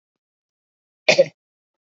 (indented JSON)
{
  "cough_length": "2.0 s",
  "cough_amplitude": 29369,
  "cough_signal_mean_std_ratio": 0.2,
  "survey_phase": "beta (2021-08-13 to 2022-03-07)",
  "age": "45-64",
  "gender": "Male",
  "wearing_mask": "No",
  "symptom_none": true,
  "smoker_status": "Never smoked",
  "respiratory_condition_asthma": false,
  "respiratory_condition_other": false,
  "recruitment_source": "REACT",
  "submission_delay": "3 days",
  "covid_test_result": "Negative",
  "covid_test_method": "RT-qPCR"
}